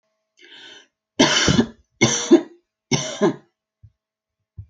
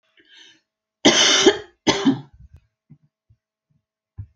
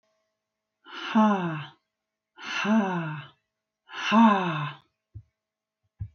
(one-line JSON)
{"three_cough_length": "4.7 s", "three_cough_amplitude": 27184, "three_cough_signal_mean_std_ratio": 0.37, "cough_length": "4.4 s", "cough_amplitude": 29029, "cough_signal_mean_std_ratio": 0.34, "exhalation_length": "6.1 s", "exhalation_amplitude": 14096, "exhalation_signal_mean_std_ratio": 0.44, "survey_phase": "alpha (2021-03-01 to 2021-08-12)", "age": "45-64", "gender": "Female", "wearing_mask": "No", "symptom_none": true, "smoker_status": "Never smoked", "respiratory_condition_asthma": false, "respiratory_condition_other": false, "recruitment_source": "REACT", "submission_delay": "2 days", "covid_test_result": "Negative", "covid_test_method": "RT-qPCR"}